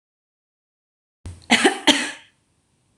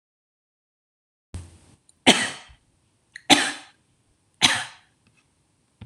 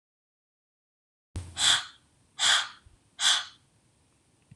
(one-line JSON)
{"cough_length": "3.0 s", "cough_amplitude": 26027, "cough_signal_mean_std_ratio": 0.29, "three_cough_length": "5.9 s", "three_cough_amplitude": 26028, "three_cough_signal_mean_std_ratio": 0.24, "exhalation_length": "4.6 s", "exhalation_amplitude": 12572, "exhalation_signal_mean_std_ratio": 0.34, "survey_phase": "alpha (2021-03-01 to 2021-08-12)", "age": "18-44", "gender": "Female", "wearing_mask": "No", "symptom_none": true, "smoker_status": "Never smoked", "respiratory_condition_asthma": false, "respiratory_condition_other": false, "recruitment_source": "REACT", "submission_delay": "1 day", "covid_test_result": "Negative", "covid_test_method": "RT-qPCR"}